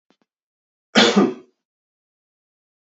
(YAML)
cough_length: 2.8 s
cough_amplitude: 28130
cough_signal_mean_std_ratio: 0.28
survey_phase: beta (2021-08-13 to 2022-03-07)
age: 45-64
gender: Male
wearing_mask: 'No'
symptom_none: true
smoker_status: Never smoked
respiratory_condition_asthma: false
respiratory_condition_other: false
recruitment_source: REACT
submission_delay: 2 days
covid_test_result: Negative
covid_test_method: RT-qPCR
influenza_a_test_result: Negative
influenza_b_test_result: Negative